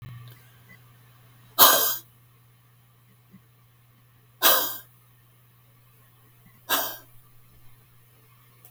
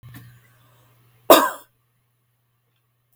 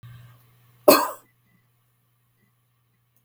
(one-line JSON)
{"exhalation_length": "8.7 s", "exhalation_amplitude": 32709, "exhalation_signal_mean_std_ratio": 0.26, "three_cough_length": "3.2 s", "three_cough_amplitude": 32768, "three_cough_signal_mean_std_ratio": 0.19, "cough_length": "3.2 s", "cough_amplitude": 32768, "cough_signal_mean_std_ratio": 0.19, "survey_phase": "beta (2021-08-13 to 2022-03-07)", "age": "65+", "gender": "Female", "wearing_mask": "No", "symptom_none": true, "smoker_status": "Ex-smoker", "respiratory_condition_asthma": false, "respiratory_condition_other": false, "recruitment_source": "REACT", "submission_delay": "1 day", "covid_test_result": "Negative", "covid_test_method": "RT-qPCR"}